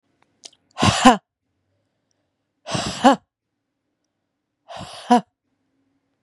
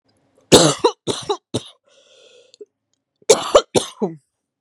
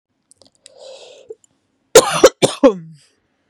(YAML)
exhalation_length: 6.2 s
exhalation_amplitude: 32767
exhalation_signal_mean_std_ratio: 0.25
cough_length: 4.6 s
cough_amplitude: 32768
cough_signal_mean_std_ratio: 0.32
three_cough_length: 3.5 s
three_cough_amplitude: 32768
three_cough_signal_mean_std_ratio: 0.27
survey_phase: beta (2021-08-13 to 2022-03-07)
age: 18-44
gender: Female
wearing_mask: 'No'
symptom_cough_any: true
symptom_onset: 5 days
smoker_status: Never smoked
respiratory_condition_asthma: false
respiratory_condition_other: false
recruitment_source: REACT
submission_delay: 0 days
covid_test_result: Negative
covid_test_method: RT-qPCR
influenza_a_test_result: Negative
influenza_b_test_result: Negative